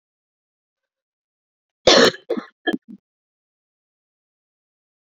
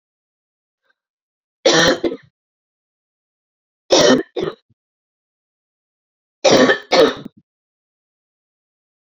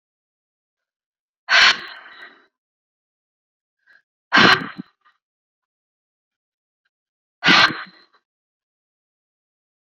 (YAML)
cough_length: 5.0 s
cough_amplitude: 29023
cough_signal_mean_std_ratio: 0.21
three_cough_length: 9.0 s
three_cough_amplitude: 32767
three_cough_signal_mean_std_ratio: 0.31
exhalation_length: 9.9 s
exhalation_amplitude: 29820
exhalation_signal_mean_std_ratio: 0.24
survey_phase: beta (2021-08-13 to 2022-03-07)
age: 18-44
gender: Female
wearing_mask: 'No'
symptom_cough_any: true
symptom_runny_or_blocked_nose: true
symptom_shortness_of_breath: true
symptom_sore_throat: true
symptom_fatigue: true
symptom_fever_high_temperature: true
symptom_headache: true
symptom_onset: 2 days
smoker_status: Never smoked
respiratory_condition_asthma: false
respiratory_condition_other: false
recruitment_source: Test and Trace
submission_delay: 2 days
covid_test_result: Positive
covid_test_method: RT-qPCR